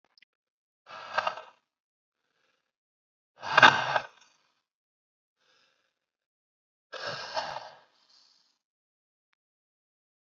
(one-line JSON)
{"exhalation_length": "10.3 s", "exhalation_amplitude": 26480, "exhalation_signal_mean_std_ratio": 0.19, "survey_phase": "beta (2021-08-13 to 2022-03-07)", "age": "18-44", "gender": "Male", "wearing_mask": "No", "symptom_runny_or_blocked_nose": true, "symptom_sore_throat": true, "symptom_other": true, "smoker_status": "Current smoker (1 to 10 cigarettes per day)", "respiratory_condition_asthma": false, "respiratory_condition_other": false, "recruitment_source": "Test and Trace", "submission_delay": "1 day", "covid_test_result": "Positive", "covid_test_method": "RT-qPCR", "covid_ct_value": 21.6, "covid_ct_gene": "ORF1ab gene"}